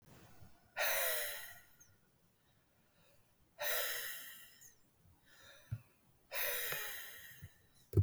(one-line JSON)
{"exhalation_length": "8.0 s", "exhalation_amplitude": 3005, "exhalation_signal_mean_std_ratio": 0.45, "survey_phase": "beta (2021-08-13 to 2022-03-07)", "age": "45-64", "gender": "Male", "wearing_mask": "No", "symptom_none": true, "smoker_status": "Ex-smoker", "respiratory_condition_asthma": true, "respiratory_condition_other": false, "recruitment_source": "Test and Trace", "submission_delay": "1 day", "covid_test_result": "Positive", "covid_test_method": "ePCR"}